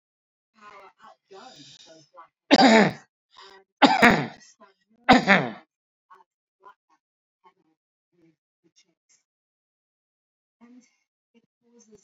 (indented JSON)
{
  "three_cough_length": "12.0 s",
  "three_cough_amplitude": 32767,
  "three_cough_signal_mean_std_ratio": 0.24,
  "survey_phase": "alpha (2021-03-01 to 2021-08-12)",
  "age": "45-64",
  "gender": "Male",
  "wearing_mask": "No",
  "symptom_none": true,
  "smoker_status": "Never smoked",
  "respiratory_condition_asthma": false,
  "respiratory_condition_other": false,
  "recruitment_source": "REACT",
  "submission_delay": "2 days",
  "covid_test_result": "Negative",
  "covid_test_method": "RT-qPCR"
}